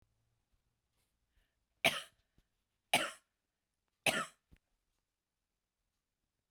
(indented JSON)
{
  "three_cough_length": "6.5 s",
  "three_cough_amplitude": 5976,
  "three_cough_signal_mean_std_ratio": 0.19,
  "survey_phase": "beta (2021-08-13 to 2022-03-07)",
  "age": "45-64",
  "gender": "Female",
  "wearing_mask": "No",
  "symptom_cough_any": true,
  "symptom_runny_or_blocked_nose": true,
  "symptom_shortness_of_breath": true,
  "symptom_sore_throat": true,
  "symptom_fatigue": true,
  "symptom_headache": true,
  "symptom_onset": "2 days",
  "smoker_status": "Never smoked",
  "respiratory_condition_asthma": false,
  "respiratory_condition_other": false,
  "recruitment_source": "Test and Trace",
  "submission_delay": "2 days",
  "covid_test_result": "Positive",
  "covid_test_method": "RT-qPCR",
  "covid_ct_value": 21.3,
  "covid_ct_gene": "ORF1ab gene",
  "covid_ct_mean": 22.4,
  "covid_viral_load": "46000 copies/ml",
  "covid_viral_load_category": "Low viral load (10K-1M copies/ml)"
}